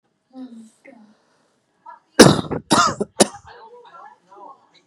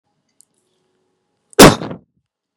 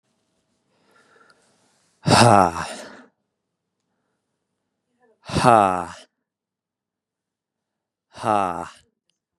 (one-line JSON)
{"three_cough_length": "4.9 s", "three_cough_amplitude": 32768, "three_cough_signal_mean_std_ratio": 0.27, "cough_length": "2.6 s", "cough_amplitude": 32768, "cough_signal_mean_std_ratio": 0.22, "exhalation_length": "9.4 s", "exhalation_amplitude": 32767, "exhalation_signal_mean_std_ratio": 0.26, "survey_phase": "beta (2021-08-13 to 2022-03-07)", "age": "18-44", "gender": "Male", "wearing_mask": "No", "symptom_none": true, "smoker_status": "Never smoked", "respiratory_condition_asthma": false, "respiratory_condition_other": false, "recruitment_source": "REACT", "submission_delay": "2 days", "covid_test_result": "Negative", "covid_test_method": "RT-qPCR", "influenza_a_test_result": "Negative", "influenza_b_test_result": "Negative"}